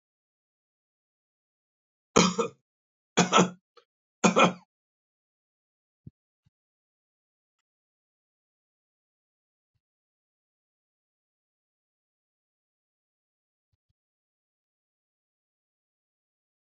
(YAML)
three_cough_length: 16.6 s
three_cough_amplitude: 19633
three_cough_signal_mean_std_ratio: 0.16
survey_phase: alpha (2021-03-01 to 2021-08-12)
age: 65+
gender: Male
wearing_mask: 'No'
symptom_cough_any: true
smoker_status: Never smoked
respiratory_condition_asthma: false
respiratory_condition_other: false
recruitment_source: Test and Trace
submission_delay: 1 day
covid_test_result: Positive
covid_test_method: RT-qPCR
covid_ct_value: 23.2
covid_ct_gene: ORF1ab gene
covid_ct_mean: 24.0
covid_viral_load: 14000 copies/ml
covid_viral_load_category: Low viral load (10K-1M copies/ml)